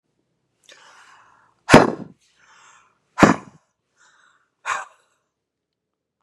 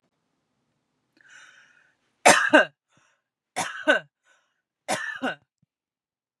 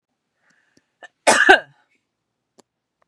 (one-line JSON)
{"exhalation_length": "6.2 s", "exhalation_amplitude": 32768, "exhalation_signal_mean_std_ratio": 0.2, "three_cough_length": "6.4 s", "three_cough_amplitude": 28743, "three_cough_signal_mean_std_ratio": 0.26, "cough_length": "3.1 s", "cough_amplitude": 32768, "cough_signal_mean_std_ratio": 0.24, "survey_phase": "beta (2021-08-13 to 2022-03-07)", "age": "45-64", "gender": "Female", "wearing_mask": "No", "symptom_runny_or_blocked_nose": true, "smoker_status": "Never smoked", "respiratory_condition_asthma": true, "respiratory_condition_other": false, "recruitment_source": "REACT", "submission_delay": "1 day", "covid_test_result": "Negative", "covid_test_method": "RT-qPCR", "influenza_a_test_result": "Unknown/Void", "influenza_b_test_result": "Unknown/Void"}